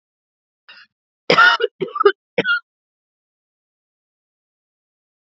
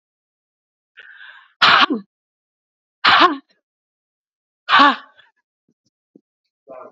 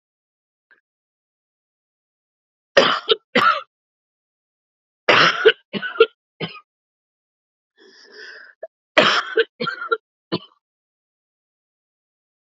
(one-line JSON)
{"cough_length": "5.2 s", "cough_amplitude": 32007, "cough_signal_mean_std_ratio": 0.28, "exhalation_length": "6.9 s", "exhalation_amplitude": 32768, "exhalation_signal_mean_std_ratio": 0.29, "three_cough_length": "12.5 s", "three_cough_amplitude": 29416, "three_cough_signal_mean_std_ratio": 0.28, "survey_phase": "beta (2021-08-13 to 2022-03-07)", "age": "45-64", "gender": "Female", "wearing_mask": "No", "symptom_runny_or_blocked_nose": true, "symptom_sore_throat": true, "symptom_fatigue": true, "symptom_loss_of_taste": true, "symptom_onset": "3 days", "smoker_status": "Ex-smoker", "respiratory_condition_asthma": true, "respiratory_condition_other": false, "recruitment_source": "Test and Trace", "submission_delay": "2 days", "covid_test_result": "Positive", "covid_test_method": "RT-qPCR", "covid_ct_value": 21.6, "covid_ct_gene": "ORF1ab gene", "covid_ct_mean": 21.8, "covid_viral_load": "69000 copies/ml", "covid_viral_load_category": "Low viral load (10K-1M copies/ml)"}